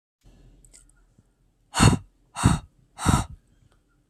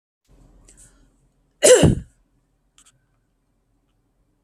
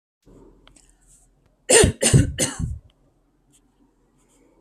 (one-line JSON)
{"exhalation_length": "4.1 s", "exhalation_amplitude": 25030, "exhalation_signal_mean_std_ratio": 0.3, "cough_length": "4.4 s", "cough_amplitude": 29783, "cough_signal_mean_std_ratio": 0.22, "three_cough_length": "4.6 s", "three_cough_amplitude": 29300, "three_cough_signal_mean_std_ratio": 0.31, "survey_phase": "beta (2021-08-13 to 2022-03-07)", "age": "18-44", "gender": "Female", "wearing_mask": "No", "symptom_none": true, "smoker_status": "Never smoked", "respiratory_condition_asthma": false, "respiratory_condition_other": false, "recruitment_source": "REACT", "submission_delay": "1 day", "covid_test_result": "Negative", "covid_test_method": "RT-qPCR"}